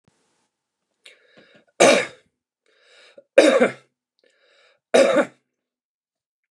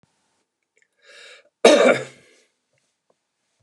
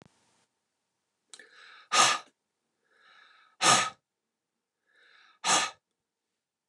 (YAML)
three_cough_length: 6.5 s
three_cough_amplitude: 29203
three_cough_signal_mean_std_ratio: 0.29
cough_length: 3.6 s
cough_amplitude: 29204
cough_signal_mean_std_ratio: 0.25
exhalation_length: 6.7 s
exhalation_amplitude: 13615
exhalation_signal_mean_std_ratio: 0.27
survey_phase: beta (2021-08-13 to 2022-03-07)
age: 45-64
gender: Male
wearing_mask: 'No'
symptom_none: true
smoker_status: Never smoked
respiratory_condition_asthma: false
respiratory_condition_other: false
recruitment_source: REACT
submission_delay: 5 days
covid_test_result: Negative
covid_test_method: RT-qPCR
influenza_a_test_result: Negative
influenza_b_test_result: Negative